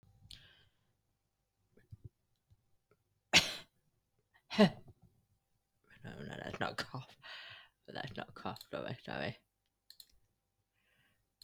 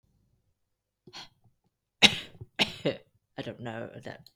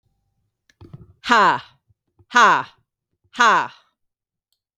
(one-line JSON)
{"three_cough_length": "11.4 s", "three_cough_amplitude": 11480, "three_cough_signal_mean_std_ratio": 0.24, "cough_length": "4.4 s", "cough_amplitude": 29868, "cough_signal_mean_std_ratio": 0.24, "exhalation_length": "4.8 s", "exhalation_amplitude": 32768, "exhalation_signal_mean_std_ratio": 0.34, "survey_phase": "beta (2021-08-13 to 2022-03-07)", "age": "18-44", "gender": "Female", "wearing_mask": "No", "symptom_none": true, "smoker_status": "Ex-smoker", "respiratory_condition_asthma": true, "respiratory_condition_other": false, "recruitment_source": "REACT", "submission_delay": "2 days", "covid_test_result": "Negative", "covid_test_method": "RT-qPCR", "influenza_a_test_result": "Negative", "influenza_b_test_result": "Negative"}